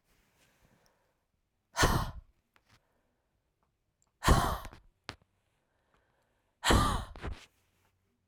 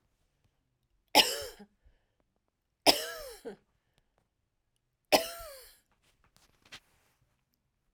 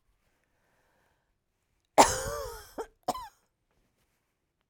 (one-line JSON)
{"exhalation_length": "8.3 s", "exhalation_amplitude": 10002, "exhalation_signal_mean_std_ratio": 0.29, "three_cough_length": "7.9 s", "three_cough_amplitude": 22919, "three_cough_signal_mean_std_ratio": 0.2, "cough_length": "4.7 s", "cough_amplitude": 21657, "cough_signal_mean_std_ratio": 0.21, "survey_phase": "alpha (2021-03-01 to 2021-08-12)", "age": "45-64", "gender": "Female", "wearing_mask": "No", "symptom_none": true, "symptom_onset": "12 days", "smoker_status": "Ex-smoker", "respiratory_condition_asthma": false, "respiratory_condition_other": false, "recruitment_source": "REACT", "submission_delay": "1 day", "covid_test_result": "Negative", "covid_test_method": "RT-qPCR"}